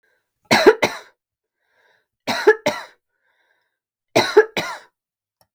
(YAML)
three_cough_length: 5.5 s
three_cough_amplitude: 32768
three_cough_signal_mean_std_ratio: 0.3
survey_phase: beta (2021-08-13 to 2022-03-07)
age: 45-64
gender: Female
wearing_mask: 'No'
symptom_none: true
smoker_status: Never smoked
respiratory_condition_asthma: false
respiratory_condition_other: false
recruitment_source: REACT
submission_delay: 1 day
covid_test_result: Negative
covid_test_method: RT-qPCR